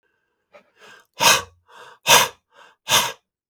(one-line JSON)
{"exhalation_length": "3.5 s", "exhalation_amplitude": 32768, "exhalation_signal_mean_std_ratio": 0.33, "survey_phase": "beta (2021-08-13 to 2022-03-07)", "age": "65+", "gender": "Male", "wearing_mask": "No", "symptom_none": true, "smoker_status": "Ex-smoker", "respiratory_condition_asthma": false, "respiratory_condition_other": false, "recruitment_source": "REACT", "submission_delay": "2 days", "covid_test_result": "Negative", "covid_test_method": "RT-qPCR", "influenza_a_test_result": "Negative", "influenza_b_test_result": "Negative"}